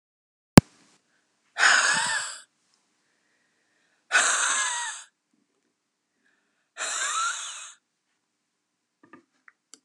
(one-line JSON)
{"exhalation_length": "9.8 s", "exhalation_amplitude": 32768, "exhalation_signal_mean_std_ratio": 0.29, "survey_phase": "beta (2021-08-13 to 2022-03-07)", "age": "45-64", "gender": "Female", "wearing_mask": "No", "symptom_runny_or_blocked_nose": true, "symptom_fatigue": true, "symptom_headache": true, "smoker_status": "Never smoked", "respiratory_condition_asthma": false, "respiratory_condition_other": false, "recruitment_source": "Test and Trace", "submission_delay": "2 days", "covid_test_result": "Positive", "covid_test_method": "RT-qPCR"}